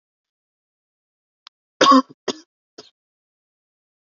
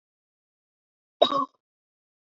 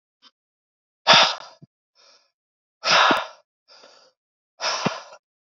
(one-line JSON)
{"three_cough_length": "4.1 s", "three_cough_amplitude": 32767, "three_cough_signal_mean_std_ratio": 0.2, "cough_length": "2.4 s", "cough_amplitude": 24580, "cough_signal_mean_std_ratio": 0.2, "exhalation_length": "5.5 s", "exhalation_amplitude": 27329, "exhalation_signal_mean_std_ratio": 0.31, "survey_phase": "beta (2021-08-13 to 2022-03-07)", "age": "18-44", "gender": "Male", "wearing_mask": "No", "symptom_cough_any": true, "symptom_runny_or_blocked_nose": true, "symptom_sore_throat": true, "symptom_onset": "4 days", "smoker_status": "Never smoked", "respiratory_condition_asthma": true, "respiratory_condition_other": false, "recruitment_source": "Test and Trace", "submission_delay": "1 day", "covid_test_result": "Positive", "covid_test_method": "RT-qPCR", "covid_ct_value": 30.8, "covid_ct_gene": "N gene"}